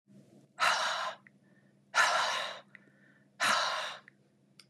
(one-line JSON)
{"exhalation_length": "4.7 s", "exhalation_amplitude": 6980, "exhalation_signal_mean_std_ratio": 0.5, "survey_phase": "beta (2021-08-13 to 2022-03-07)", "age": "65+", "gender": "Female", "wearing_mask": "No", "symptom_none": true, "smoker_status": "Never smoked", "respiratory_condition_asthma": false, "respiratory_condition_other": false, "recruitment_source": "REACT", "submission_delay": "2 days", "covid_test_result": "Negative", "covid_test_method": "RT-qPCR", "influenza_a_test_result": "Negative", "influenza_b_test_result": "Negative"}